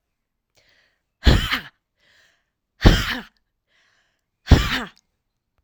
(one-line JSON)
{"exhalation_length": "5.6 s", "exhalation_amplitude": 32768, "exhalation_signal_mean_std_ratio": 0.27, "survey_phase": "alpha (2021-03-01 to 2021-08-12)", "age": "45-64", "gender": "Female", "wearing_mask": "No", "symptom_none": true, "smoker_status": "Never smoked", "respiratory_condition_asthma": false, "respiratory_condition_other": false, "recruitment_source": "REACT", "submission_delay": "2 days", "covid_test_result": "Negative", "covid_test_method": "RT-qPCR"}